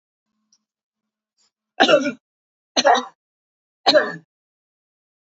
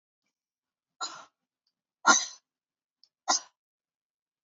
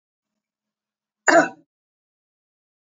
three_cough_length: 5.3 s
three_cough_amplitude: 29718
three_cough_signal_mean_std_ratio: 0.29
exhalation_length: 4.4 s
exhalation_amplitude: 16185
exhalation_signal_mean_std_ratio: 0.2
cough_length: 2.9 s
cough_amplitude: 28290
cough_signal_mean_std_ratio: 0.2
survey_phase: beta (2021-08-13 to 2022-03-07)
age: 65+
gender: Female
wearing_mask: 'No'
symptom_runny_or_blocked_nose: true
smoker_status: Never smoked
respiratory_condition_asthma: false
respiratory_condition_other: false
recruitment_source: Test and Trace
submission_delay: 2 days
covid_test_result: Positive
covid_test_method: RT-qPCR
covid_ct_value: 27.1
covid_ct_gene: ORF1ab gene
covid_ct_mean: 27.5
covid_viral_load: 990 copies/ml
covid_viral_load_category: Minimal viral load (< 10K copies/ml)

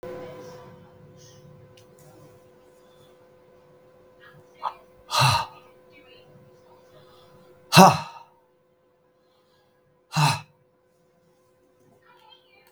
exhalation_length: 12.7 s
exhalation_amplitude: 32768
exhalation_signal_mean_std_ratio: 0.22
survey_phase: beta (2021-08-13 to 2022-03-07)
age: 65+
gender: Male
wearing_mask: 'No'
symptom_none: true
smoker_status: Ex-smoker
respiratory_condition_asthma: false
respiratory_condition_other: false
recruitment_source: REACT
submission_delay: 1 day
covid_test_result: Negative
covid_test_method: RT-qPCR
influenza_a_test_result: Negative
influenza_b_test_result: Negative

